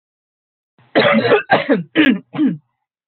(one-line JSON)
{"cough_length": "3.1 s", "cough_amplitude": 28834, "cough_signal_mean_std_ratio": 0.53, "survey_phase": "beta (2021-08-13 to 2022-03-07)", "age": "45-64", "gender": "Female", "wearing_mask": "No", "symptom_cough_any": true, "symptom_runny_or_blocked_nose": true, "symptom_sore_throat": true, "symptom_headache": true, "symptom_onset": "5 days", "smoker_status": "Never smoked", "respiratory_condition_asthma": false, "respiratory_condition_other": false, "recruitment_source": "Test and Trace", "submission_delay": "1 day", "covid_test_result": "Positive", "covid_test_method": "RT-qPCR"}